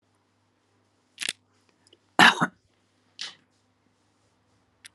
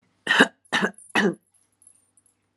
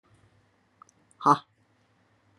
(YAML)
cough_length: 4.9 s
cough_amplitude: 25564
cough_signal_mean_std_ratio: 0.18
three_cough_length: 2.6 s
three_cough_amplitude: 31840
three_cough_signal_mean_std_ratio: 0.35
exhalation_length: 2.4 s
exhalation_amplitude: 16842
exhalation_signal_mean_std_ratio: 0.18
survey_phase: alpha (2021-03-01 to 2021-08-12)
age: 65+
gender: Female
wearing_mask: 'No'
symptom_cough_any: true
symptom_new_continuous_cough: true
symptom_shortness_of_breath: true
symptom_fatigue: true
symptom_headache: true
symptom_onset: 6 days
smoker_status: Never smoked
respiratory_condition_asthma: false
respiratory_condition_other: false
recruitment_source: Test and Trace
submission_delay: 2 days
covid_test_result: Positive
covid_test_method: RT-qPCR
covid_ct_value: 23.0
covid_ct_gene: ORF1ab gene